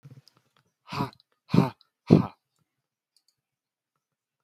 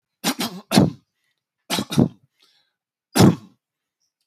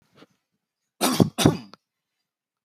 exhalation_length: 4.4 s
exhalation_amplitude: 25614
exhalation_signal_mean_std_ratio: 0.2
three_cough_length: 4.3 s
three_cough_amplitude: 28208
three_cough_signal_mean_std_ratio: 0.32
cough_length: 2.6 s
cough_amplitude: 26625
cough_signal_mean_std_ratio: 0.28
survey_phase: beta (2021-08-13 to 2022-03-07)
age: 18-44
gender: Male
wearing_mask: 'No'
symptom_none: true
smoker_status: Never smoked
respiratory_condition_asthma: false
respiratory_condition_other: false
recruitment_source: REACT
submission_delay: 1 day
covid_test_result: Negative
covid_test_method: RT-qPCR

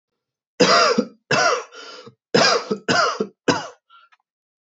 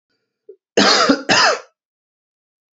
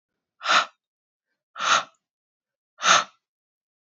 three_cough_length: 4.7 s
three_cough_amplitude: 26658
three_cough_signal_mean_std_ratio: 0.49
cough_length: 2.7 s
cough_amplitude: 28646
cough_signal_mean_std_ratio: 0.43
exhalation_length: 3.8 s
exhalation_amplitude: 24342
exhalation_signal_mean_std_ratio: 0.31
survey_phase: alpha (2021-03-01 to 2021-08-12)
age: 18-44
gender: Male
wearing_mask: 'No'
symptom_cough_any: true
symptom_new_continuous_cough: true
symptom_fatigue: true
symptom_headache: true
symptom_loss_of_taste: true
symptom_onset: 3 days
smoker_status: Never smoked
respiratory_condition_asthma: false
respiratory_condition_other: false
recruitment_source: Test and Trace
submission_delay: 2 days
covid_test_result: Positive
covid_test_method: RT-qPCR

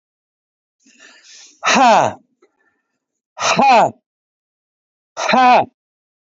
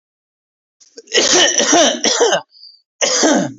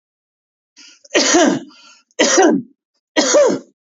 exhalation_length: 6.3 s
exhalation_amplitude: 28973
exhalation_signal_mean_std_ratio: 0.39
cough_length: 3.6 s
cough_amplitude: 30002
cough_signal_mean_std_ratio: 0.62
three_cough_length: 3.8 s
three_cough_amplitude: 32395
three_cough_signal_mean_std_ratio: 0.52
survey_phase: alpha (2021-03-01 to 2021-08-12)
age: 18-44
gender: Male
wearing_mask: 'Yes'
symptom_none: true
smoker_status: Current smoker (1 to 10 cigarettes per day)
respiratory_condition_asthma: false
respiratory_condition_other: false
recruitment_source: REACT
submission_delay: 2 days
covid_test_result: Negative
covid_test_method: RT-qPCR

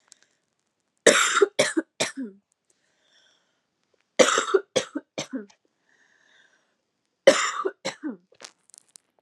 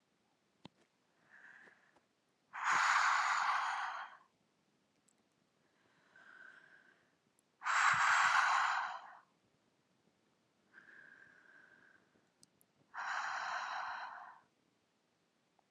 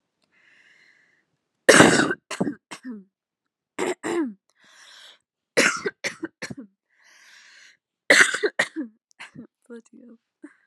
three_cough_length: 9.2 s
three_cough_amplitude: 29784
three_cough_signal_mean_std_ratio: 0.3
exhalation_length: 15.7 s
exhalation_amplitude: 4021
exhalation_signal_mean_std_ratio: 0.41
cough_length: 10.7 s
cough_amplitude: 32768
cough_signal_mean_std_ratio: 0.3
survey_phase: alpha (2021-03-01 to 2021-08-12)
age: 18-44
gender: Female
wearing_mask: 'No'
symptom_cough_any: true
symptom_shortness_of_breath: true
symptom_abdominal_pain: true
symptom_diarrhoea: true
symptom_fatigue: true
symptom_fever_high_temperature: true
symptom_headache: true
symptom_change_to_sense_of_smell_or_taste: true
symptom_loss_of_taste: true
symptom_onset: 5 days
smoker_status: Current smoker (e-cigarettes or vapes only)
respiratory_condition_asthma: false
respiratory_condition_other: false
recruitment_source: Test and Trace
submission_delay: 1 day
covid_test_result: Positive
covid_test_method: RT-qPCR
covid_ct_value: 19.3
covid_ct_gene: ORF1ab gene
covid_ct_mean: 19.7
covid_viral_load: 340000 copies/ml
covid_viral_load_category: Low viral load (10K-1M copies/ml)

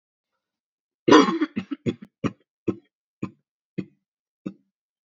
cough_length: 5.1 s
cough_amplitude: 26949
cough_signal_mean_std_ratio: 0.25
survey_phase: beta (2021-08-13 to 2022-03-07)
age: 18-44
gender: Female
wearing_mask: 'No'
symptom_cough_any: true
symptom_new_continuous_cough: true
symptom_runny_or_blocked_nose: true
symptom_shortness_of_breath: true
symptom_sore_throat: true
symptom_diarrhoea: true
symptom_fatigue: true
symptom_headache: true
symptom_onset: 4 days
smoker_status: Never smoked
respiratory_condition_asthma: false
respiratory_condition_other: false
recruitment_source: Test and Trace
submission_delay: 1 day
covid_test_result: Positive
covid_test_method: RT-qPCR
covid_ct_value: 13.8
covid_ct_gene: ORF1ab gene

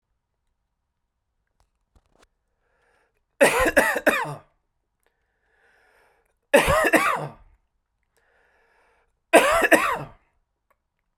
three_cough_length: 11.2 s
three_cough_amplitude: 32097
three_cough_signal_mean_std_ratio: 0.32
survey_phase: beta (2021-08-13 to 2022-03-07)
age: 18-44
gender: Male
wearing_mask: 'No'
symptom_none: true
smoker_status: Never smoked
respiratory_condition_asthma: false
respiratory_condition_other: false
recruitment_source: REACT
submission_delay: 0 days
covid_test_result: Negative
covid_test_method: RT-qPCR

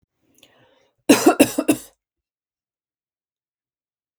three_cough_length: 4.2 s
three_cough_amplitude: 32768
three_cough_signal_mean_std_ratio: 0.24
survey_phase: beta (2021-08-13 to 2022-03-07)
age: 45-64
gender: Female
wearing_mask: 'No'
symptom_none: true
smoker_status: Never smoked
respiratory_condition_asthma: false
respiratory_condition_other: false
recruitment_source: REACT
submission_delay: 5 days
covid_test_result: Negative
covid_test_method: RT-qPCR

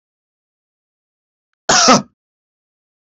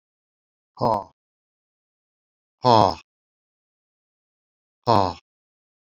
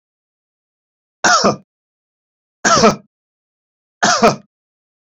cough_length: 3.1 s
cough_amplitude: 31421
cough_signal_mean_std_ratio: 0.26
exhalation_length: 6.0 s
exhalation_amplitude: 26085
exhalation_signal_mean_std_ratio: 0.22
three_cough_length: 5.0 s
three_cough_amplitude: 31038
three_cough_signal_mean_std_ratio: 0.34
survey_phase: beta (2021-08-13 to 2022-03-07)
age: 65+
gender: Male
wearing_mask: 'No'
symptom_diarrhoea: true
smoker_status: Never smoked
respiratory_condition_asthma: false
respiratory_condition_other: false
recruitment_source: REACT
submission_delay: 1 day
covid_test_result: Negative
covid_test_method: RT-qPCR
influenza_a_test_result: Negative
influenza_b_test_result: Negative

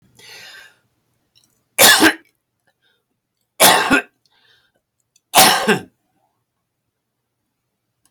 three_cough_length: 8.1 s
three_cough_amplitude: 32768
three_cough_signal_mean_std_ratio: 0.3
survey_phase: alpha (2021-03-01 to 2021-08-12)
age: 65+
gender: Male
wearing_mask: 'No'
symptom_cough_any: true
smoker_status: Ex-smoker
respiratory_condition_asthma: false
respiratory_condition_other: true
recruitment_source: REACT
submission_delay: 2 days
covid_test_result: Negative
covid_test_method: RT-qPCR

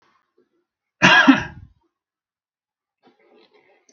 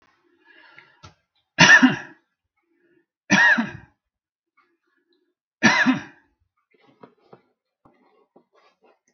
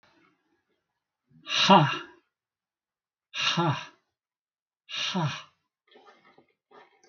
cough_length: 3.9 s
cough_amplitude: 32768
cough_signal_mean_std_ratio: 0.25
three_cough_length: 9.1 s
three_cough_amplitude: 32768
three_cough_signal_mean_std_ratio: 0.27
exhalation_length: 7.1 s
exhalation_amplitude: 21010
exhalation_signal_mean_std_ratio: 0.31
survey_phase: beta (2021-08-13 to 2022-03-07)
age: 65+
gender: Male
wearing_mask: 'No'
symptom_none: true
smoker_status: Ex-smoker
respiratory_condition_asthma: false
respiratory_condition_other: false
recruitment_source: REACT
submission_delay: 1 day
covid_test_result: Negative
covid_test_method: RT-qPCR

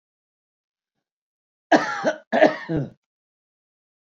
cough_length: 4.2 s
cough_amplitude: 26227
cough_signal_mean_std_ratio: 0.3
survey_phase: beta (2021-08-13 to 2022-03-07)
age: 65+
gender: Male
wearing_mask: 'No'
symptom_none: true
smoker_status: Ex-smoker
respiratory_condition_asthma: false
respiratory_condition_other: false
recruitment_source: REACT
submission_delay: 3 days
covid_test_result: Negative
covid_test_method: RT-qPCR
influenza_a_test_result: Negative
influenza_b_test_result: Negative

